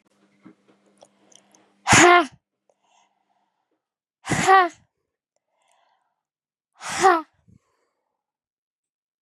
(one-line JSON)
{"exhalation_length": "9.2 s", "exhalation_amplitude": 30090, "exhalation_signal_mean_std_ratio": 0.25, "survey_phase": "beta (2021-08-13 to 2022-03-07)", "age": "18-44", "gender": "Female", "wearing_mask": "No", "symptom_runny_or_blocked_nose": true, "symptom_fatigue": true, "symptom_other": true, "symptom_onset": "3 days", "smoker_status": "Never smoked", "respiratory_condition_asthma": false, "respiratory_condition_other": false, "recruitment_source": "Test and Trace", "submission_delay": "1 day", "covid_test_result": "Positive", "covid_test_method": "RT-qPCR", "covid_ct_value": 18.2, "covid_ct_gene": "ORF1ab gene", "covid_ct_mean": 18.4, "covid_viral_load": "920000 copies/ml", "covid_viral_load_category": "Low viral load (10K-1M copies/ml)"}